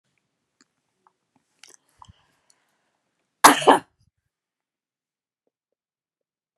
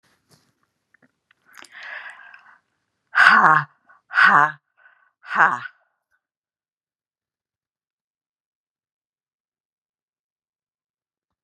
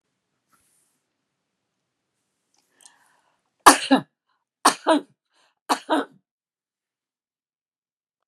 cough_length: 6.6 s
cough_amplitude: 32768
cough_signal_mean_std_ratio: 0.15
exhalation_length: 11.4 s
exhalation_amplitude: 32768
exhalation_signal_mean_std_ratio: 0.24
three_cough_length: 8.3 s
three_cough_amplitude: 32768
three_cough_signal_mean_std_ratio: 0.19
survey_phase: beta (2021-08-13 to 2022-03-07)
age: 45-64
gender: Female
wearing_mask: 'No'
symptom_none: true
smoker_status: Never smoked
respiratory_condition_asthma: false
respiratory_condition_other: false
recruitment_source: REACT
submission_delay: 1 day
covid_test_result: Negative
covid_test_method: RT-qPCR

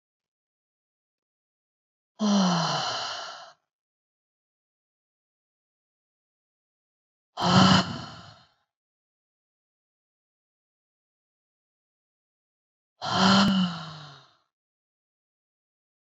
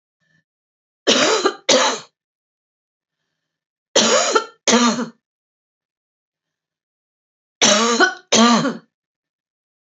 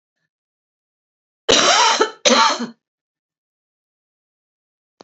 exhalation_length: 16.0 s
exhalation_amplitude: 17180
exhalation_signal_mean_std_ratio: 0.3
three_cough_length: 10.0 s
three_cough_amplitude: 32768
three_cough_signal_mean_std_ratio: 0.4
cough_length: 5.0 s
cough_amplitude: 28931
cough_signal_mean_std_ratio: 0.35
survey_phase: beta (2021-08-13 to 2022-03-07)
age: 45-64
gender: Female
wearing_mask: 'No'
symptom_none: true
smoker_status: Ex-smoker
respiratory_condition_asthma: true
respiratory_condition_other: false
recruitment_source: REACT
submission_delay: 2 days
covid_test_result: Negative
covid_test_method: RT-qPCR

